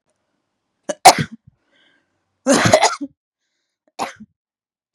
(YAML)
three_cough_length: 4.9 s
three_cough_amplitude: 32768
three_cough_signal_mean_std_ratio: 0.27
survey_phase: beta (2021-08-13 to 2022-03-07)
age: 18-44
gender: Female
wearing_mask: 'No'
symptom_fatigue: true
symptom_onset: 13 days
smoker_status: Never smoked
respiratory_condition_asthma: false
respiratory_condition_other: false
recruitment_source: REACT
submission_delay: 1 day
covid_test_result: Negative
covid_test_method: RT-qPCR
influenza_a_test_result: Negative
influenza_b_test_result: Negative